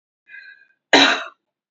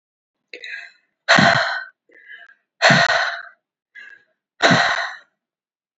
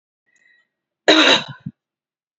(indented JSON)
{
  "three_cough_length": "1.7 s",
  "three_cough_amplitude": 29004,
  "three_cough_signal_mean_std_ratio": 0.32,
  "exhalation_length": "6.0 s",
  "exhalation_amplitude": 29710,
  "exhalation_signal_mean_std_ratio": 0.41,
  "cough_length": "2.4 s",
  "cough_amplitude": 29989,
  "cough_signal_mean_std_ratio": 0.31,
  "survey_phase": "beta (2021-08-13 to 2022-03-07)",
  "age": "18-44",
  "gender": "Female",
  "wearing_mask": "No",
  "symptom_none": true,
  "smoker_status": "Never smoked",
  "respiratory_condition_asthma": false,
  "respiratory_condition_other": false,
  "recruitment_source": "REACT",
  "submission_delay": "2 days",
  "covid_test_result": "Negative",
  "covid_test_method": "RT-qPCR",
  "influenza_a_test_result": "Negative",
  "influenza_b_test_result": "Negative"
}